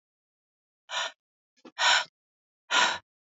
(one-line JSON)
{"exhalation_length": "3.3 s", "exhalation_amplitude": 12026, "exhalation_signal_mean_std_ratio": 0.34, "survey_phase": "beta (2021-08-13 to 2022-03-07)", "age": "45-64", "gender": "Female", "wearing_mask": "No", "symptom_cough_any": true, "symptom_runny_or_blocked_nose": true, "symptom_sore_throat": true, "symptom_abdominal_pain": true, "symptom_diarrhoea": true, "symptom_fatigue": true, "symptom_fever_high_temperature": true, "symptom_headache": true, "symptom_other": true, "smoker_status": "Never smoked", "respiratory_condition_asthma": false, "respiratory_condition_other": false, "recruitment_source": "Test and Trace", "submission_delay": "1 day", "covid_test_result": "Positive", "covid_test_method": "RT-qPCR", "covid_ct_value": 22.4, "covid_ct_gene": "N gene"}